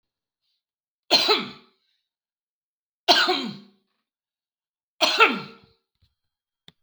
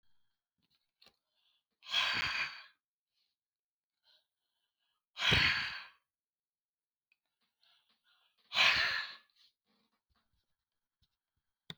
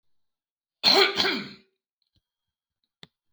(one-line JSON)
{"three_cough_length": "6.8 s", "three_cough_amplitude": 23121, "three_cough_signal_mean_std_ratio": 0.3, "exhalation_length": "11.8 s", "exhalation_amplitude": 6250, "exhalation_signal_mean_std_ratio": 0.3, "cough_length": "3.3 s", "cough_amplitude": 19273, "cough_signal_mean_std_ratio": 0.31, "survey_phase": "beta (2021-08-13 to 2022-03-07)", "age": "45-64", "gender": "Male", "wearing_mask": "No", "symptom_none": true, "smoker_status": "Never smoked", "respiratory_condition_asthma": false, "respiratory_condition_other": false, "recruitment_source": "REACT", "submission_delay": "4 days", "covid_test_result": "Negative", "covid_test_method": "RT-qPCR"}